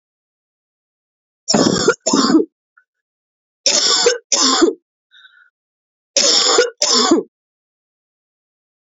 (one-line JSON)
{"three_cough_length": "8.9 s", "three_cough_amplitude": 32768, "three_cough_signal_mean_std_ratio": 0.46, "survey_phase": "alpha (2021-03-01 to 2021-08-12)", "age": "45-64", "gender": "Female", "wearing_mask": "No", "symptom_cough_any": true, "symptom_abdominal_pain": true, "symptom_fatigue": true, "symptom_headache": true, "symptom_onset": "3 days", "smoker_status": "Never smoked", "respiratory_condition_asthma": false, "respiratory_condition_other": false, "recruitment_source": "Test and Trace", "submission_delay": "2 days", "covid_test_result": "Positive", "covid_test_method": "RT-qPCR", "covid_ct_value": 16.1, "covid_ct_gene": "ORF1ab gene", "covid_ct_mean": 16.3, "covid_viral_load": "4400000 copies/ml", "covid_viral_load_category": "High viral load (>1M copies/ml)"}